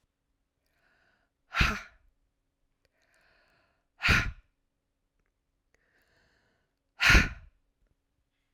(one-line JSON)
{"exhalation_length": "8.5 s", "exhalation_amplitude": 14925, "exhalation_signal_mean_std_ratio": 0.23, "survey_phase": "beta (2021-08-13 to 2022-03-07)", "age": "45-64", "gender": "Female", "wearing_mask": "No", "symptom_cough_any": true, "symptom_new_continuous_cough": true, "symptom_runny_or_blocked_nose": true, "symptom_shortness_of_breath": true, "symptom_sore_throat": true, "symptom_fatigue": true, "symptom_headache": true, "symptom_change_to_sense_of_smell_or_taste": true, "symptom_loss_of_taste": true, "symptom_other": true, "symptom_onset": "3 days", "smoker_status": "Ex-smoker", "respiratory_condition_asthma": false, "respiratory_condition_other": false, "recruitment_source": "Test and Trace", "submission_delay": "2 days", "covid_test_result": "Positive", "covid_test_method": "RT-qPCR", "covid_ct_value": 20.2, "covid_ct_gene": "ORF1ab gene"}